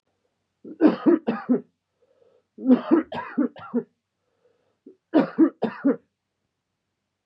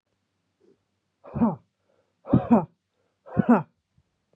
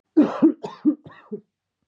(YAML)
three_cough_length: 7.3 s
three_cough_amplitude: 18874
three_cough_signal_mean_std_ratio: 0.36
exhalation_length: 4.4 s
exhalation_amplitude: 15182
exhalation_signal_mean_std_ratio: 0.3
cough_length: 1.9 s
cough_amplitude: 17270
cough_signal_mean_std_ratio: 0.39
survey_phase: beta (2021-08-13 to 2022-03-07)
age: 18-44
gender: Male
wearing_mask: 'No'
symptom_cough_any: true
symptom_runny_or_blocked_nose: true
symptom_onset: 6 days
smoker_status: Ex-smoker
respiratory_condition_asthma: false
respiratory_condition_other: false
recruitment_source: REACT
submission_delay: 1 day
covid_test_result: Negative
covid_test_method: RT-qPCR
influenza_a_test_result: Negative
influenza_b_test_result: Negative